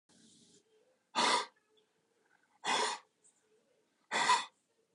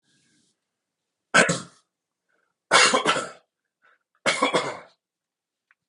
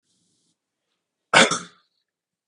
{"exhalation_length": "4.9 s", "exhalation_amplitude": 4808, "exhalation_signal_mean_std_ratio": 0.36, "three_cough_length": "5.9 s", "three_cough_amplitude": 26252, "three_cough_signal_mean_std_ratio": 0.33, "cough_length": "2.5 s", "cough_amplitude": 32699, "cough_signal_mean_std_ratio": 0.22, "survey_phase": "beta (2021-08-13 to 2022-03-07)", "age": "45-64", "gender": "Male", "wearing_mask": "No", "symptom_none": true, "smoker_status": "Ex-smoker", "respiratory_condition_asthma": false, "respiratory_condition_other": false, "recruitment_source": "REACT", "submission_delay": "0 days", "covid_test_result": "Negative", "covid_test_method": "RT-qPCR", "influenza_a_test_result": "Unknown/Void", "influenza_b_test_result": "Unknown/Void"}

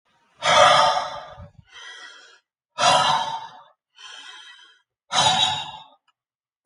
{"exhalation_length": "6.7 s", "exhalation_amplitude": 25776, "exhalation_signal_mean_std_ratio": 0.44, "survey_phase": "alpha (2021-03-01 to 2021-08-12)", "age": "45-64", "gender": "Male", "wearing_mask": "No", "symptom_none": true, "smoker_status": "Never smoked", "respiratory_condition_asthma": false, "respiratory_condition_other": false, "recruitment_source": "REACT", "submission_delay": "1 day", "covid_test_result": "Negative", "covid_test_method": "RT-qPCR"}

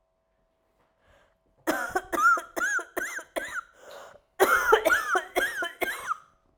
{"cough_length": "6.6 s", "cough_amplitude": 18924, "cough_signal_mean_std_ratio": 0.51, "survey_phase": "beta (2021-08-13 to 2022-03-07)", "age": "18-44", "gender": "Female", "wearing_mask": "No", "symptom_cough_any": true, "symptom_runny_or_blocked_nose": true, "symptom_shortness_of_breath": true, "symptom_sore_throat": true, "symptom_abdominal_pain": true, "symptom_fatigue": true, "symptom_fever_high_temperature": true, "symptom_headache": true, "symptom_change_to_sense_of_smell_or_taste": true, "symptom_onset": "3 days", "smoker_status": "Never smoked", "respiratory_condition_asthma": false, "respiratory_condition_other": false, "recruitment_source": "Test and Trace", "submission_delay": "1 day", "covid_test_result": "Positive", "covid_test_method": "RT-qPCR"}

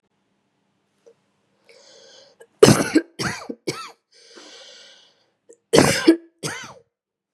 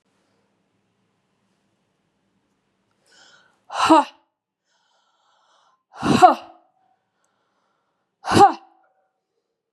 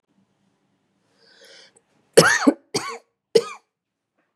{"cough_length": "7.3 s", "cough_amplitude": 32768, "cough_signal_mean_std_ratio": 0.27, "exhalation_length": "9.7 s", "exhalation_amplitude": 32235, "exhalation_signal_mean_std_ratio": 0.22, "three_cough_length": "4.4 s", "three_cough_amplitude": 32768, "three_cough_signal_mean_std_ratio": 0.25, "survey_phase": "beta (2021-08-13 to 2022-03-07)", "age": "45-64", "gender": "Female", "wearing_mask": "No", "symptom_runny_or_blocked_nose": true, "symptom_sore_throat": true, "symptom_fatigue": true, "symptom_headache": true, "symptom_onset": "3 days", "smoker_status": "Ex-smoker", "respiratory_condition_asthma": true, "respiratory_condition_other": false, "recruitment_source": "REACT", "submission_delay": "1 day", "covid_test_result": "Positive", "covid_test_method": "RT-qPCR", "covid_ct_value": 18.0, "covid_ct_gene": "E gene", "influenza_a_test_result": "Negative", "influenza_b_test_result": "Negative"}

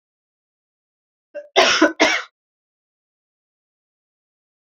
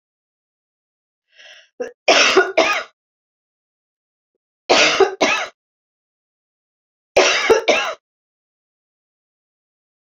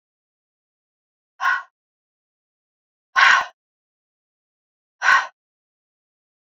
{"cough_length": "4.8 s", "cough_amplitude": 27942, "cough_signal_mean_std_ratio": 0.26, "three_cough_length": "10.1 s", "three_cough_amplitude": 32768, "three_cough_signal_mean_std_ratio": 0.35, "exhalation_length": "6.5 s", "exhalation_amplitude": 26248, "exhalation_signal_mean_std_ratio": 0.25, "survey_phase": "beta (2021-08-13 to 2022-03-07)", "age": "45-64", "gender": "Female", "wearing_mask": "No", "symptom_none": true, "smoker_status": "Never smoked", "respiratory_condition_asthma": false, "respiratory_condition_other": false, "recruitment_source": "REACT", "submission_delay": "1 day", "covid_test_result": "Negative", "covid_test_method": "RT-qPCR"}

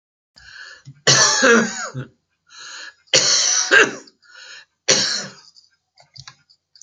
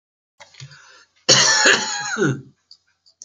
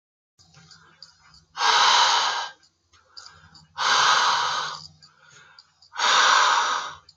{"three_cough_length": "6.8 s", "three_cough_amplitude": 32768, "three_cough_signal_mean_std_ratio": 0.44, "cough_length": "3.2 s", "cough_amplitude": 32037, "cough_signal_mean_std_ratio": 0.45, "exhalation_length": "7.2 s", "exhalation_amplitude": 19327, "exhalation_signal_mean_std_ratio": 0.54, "survey_phase": "beta (2021-08-13 to 2022-03-07)", "age": "65+", "gender": "Male", "wearing_mask": "No", "symptom_none": true, "smoker_status": "Never smoked", "respiratory_condition_asthma": false, "respiratory_condition_other": false, "recruitment_source": "REACT", "submission_delay": "1 day", "covid_test_result": "Negative", "covid_test_method": "RT-qPCR"}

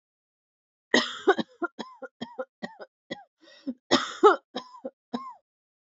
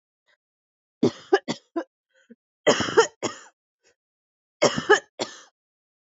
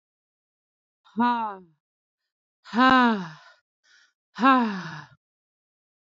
{"cough_length": "6.0 s", "cough_amplitude": 20595, "cough_signal_mean_std_ratio": 0.28, "three_cough_length": "6.1 s", "three_cough_amplitude": 23098, "three_cough_signal_mean_std_ratio": 0.29, "exhalation_length": "6.1 s", "exhalation_amplitude": 18076, "exhalation_signal_mean_std_ratio": 0.34, "survey_phase": "alpha (2021-03-01 to 2021-08-12)", "age": "18-44", "gender": "Female", "wearing_mask": "No", "symptom_fatigue": true, "symptom_fever_high_temperature": true, "symptom_headache": true, "symptom_loss_of_taste": true, "smoker_status": "Never smoked", "respiratory_condition_asthma": false, "respiratory_condition_other": false, "recruitment_source": "Test and Trace", "submission_delay": "2 days", "covid_test_result": "Positive", "covid_test_method": "RT-qPCR", "covid_ct_value": 18.3, "covid_ct_gene": "ORF1ab gene", "covid_ct_mean": 19.6, "covid_viral_load": "390000 copies/ml", "covid_viral_load_category": "Low viral load (10K-1M copies/ml)"}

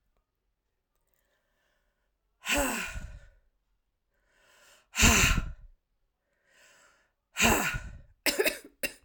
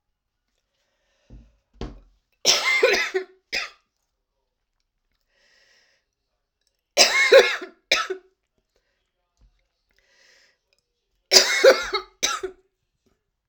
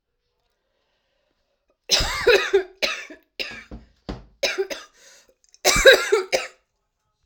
{"exhalation_length": "9.0 s", "exhalation_amplitude": 14546, "exhalation_signal_mean_std_ratio": 0.34, "three_cough_length": "13.5 s", "three_cough_amplitude": 32768, "three_cough_signal_mean_std_ratio": 0.3, "cough_length": "7.3 s", "cough_amplitude": 32768, "cough_signal_mean_std_ratio": 0.35, "survey_phase": "alpha (2021-03-01 to 2021-08-12)", "age": "45-64", "gender": "Female", "wearing_mask": "No", "symptom_cough_any": true, "symptom_shortness_of_breath": true, "symptom_diarrhoea": true, "symptom_fatigue": true, "symptom_fever_high_temperature": true, "symptom_headache": true, "symptom_change_to_sense_of_smell_or_taste": true, "symptom_loss_of_taste": true, "symptom_onset": "8 days", "smoker_status": "Never smoked", "respiratory_condition_asthma": true, "respiratory_condition_other": false, "recruitment_source": "Test and Trace", "submission_delay": "1 day", "covid_test_result": "Positive", "covid_test_method": "RT-qPCR", "covid_ct_value": 29.1, "covid_ct_gene": "ORF1ab gene", "covid_ct_mean": 29.8, "covid_viral_load": "170 copies/ml", "covid_viral_load_category": "Minimal viral load (< 10K copies/ml)"}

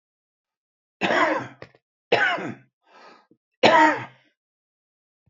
{"three_cough_length": "5.3 s", "three_cough_amplitude": 27388, "three_cough_signal_mean_std_ratio": 0.36, "survey_phase": "beta (2021-08-13 to 2022-03-07)", "age": "65+", "gender": "Male", "wearing_mask": "No", "symptom_none": true, "smoker_status": "Current smoker (11 or more cigarettes per day)", "respiratory_condition_asthma": false, "respiratory_condition_other": false, "recruitment_source": "REACT", "submission_delay": "0 days", "covid_test_result": "Negative", "covid_test_method": "RT-qPCR", "influenza_a_test_result": "Negative", "influenza_b_test_result": "Negative"}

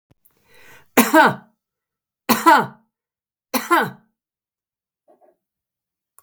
{"three_cough_length": "6.2 s", "three_cough_amplitude": 32768, "three_cough_signal_mean_std_ratio": 0.29, "survey_phase": "beta (2021-08-13 to 2022-03-07)", "age": "45-64", "gender": "Female", "wearing_mask": "No", "symptom_none": true, "smoker_status": "Never smoked", "respiratory_condition_asthma": false, "respiratory_condition_other": false, "recruitment_source": "REACT", "submission_delay": "1 day", "covid_test_result": "Negative", "covid_test_method": "RT-qPCR", "influenza_a_test_result": "Negative", "influenza_b_test_result": "Negative"}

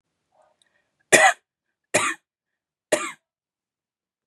{"three_cough_length": "4.3 s", "three_cough_amplitude": 32768, "three_cough_signal_mean_std_ratio": 0.25, "survey_phase": "beta (2021-08-13 to 2022-03-07)", "age": "18-44", "gender": "Female", "wearing_mask": "No", "symptom_none": true, "smoker_status": "Never smoked", "respiratory_condition_asthma": false, "respiratory_condition_other": false, "recruitment_source": "REACT", "submission_delay": "1 day", "covid_test_result": "Negative", "covid_test_method": "RT-qPCR", "influenza_a_test_result": "Negative", "influenza_b_test_result": "Negative"}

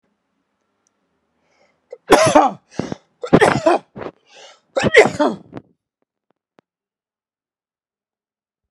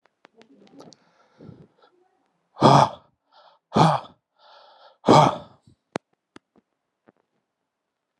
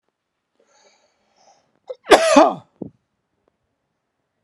{"three_cough_length": "8.7 s", "three_cough_amplitude": 32768, "three_cough_signal_mean_std_ratio": 0.3, "exhalation_length": "8.2 s", "exhalation_amplitude": 29731, "exhalation_signal_mean_std_ratio": 0.25, "cough_length": "4.4 s", "cough_amplitude": 32768, "cough_signal_mean_std_ratio": 0.24, "survey_phase": "alpha (2021-03-01 to 2021-08-12)", "age": "45-64", "gender": "Male", "wearing_mask": "No", "symptom_fatigue": true, "symptom_onset": "13 days", "smoker_status": "Ex-smoker", "respiratory_condition_asthma": false, "respiratory_condition_other": false, "recruitment_source": "REACT", "submission_delay": "1 day", "covid_test_result": "Negative", "covid_test_method": "RT-qPCR"}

